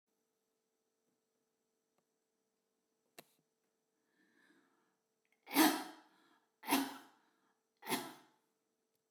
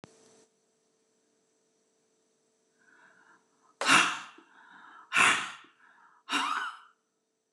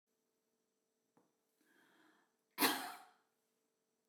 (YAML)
three_cough_length: 9.1 s
three_cough_amplitude: 4405
three_cough_signal_mean_std_ratio: 0.21
exhalation_length: 7.5 s
exhalation_amplitude: 11029
exhalation_signal_mean_std_ratio: 0.3
cough_length: 4.1 s
cough_amplitude: 3453
cough_signal_mean_std_ratio: 0.21
survey_phase: beta (2021-08-13 to 2022-03-07)
age: 45-64
gender: Female
wearing_mask: 'No'
symptom_shortness_of_breath: true
symptom_onset: 10 days
smoker_status: Never smoked
respiratory_condition_asthma: true
respiratory_condition_other: false
recruitment_source: REACT
submission_delay: 2 days
covid_test_result: Negative
covid_test_method: RT-qPCR